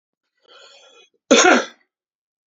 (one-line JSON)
{"cough_length": "2.5 s", "cough_amplitude": 29722, "cough_signal_mean_std_ratio": 0.3, "survey_phase": "beta (2021-08-13 to 2022-03-07)", "age": "45-64", "gender": "Male", "wearing_mask": "No", "symptom_runny_or_blocked_nose": true, "symptom_sore_throat": true, "smoker_status": "Ex-smoker", "respiratory_condition_asthma": false, "respiratory_condition_other": false, "recruitment_source": "Test and Trace", "submission_delay": "2 days", "covid_test_result": "Positive", "covid_test_method": "RT-qPCR", "covid_ct_value": 20.1, "covid_ct_gene": "N gene"}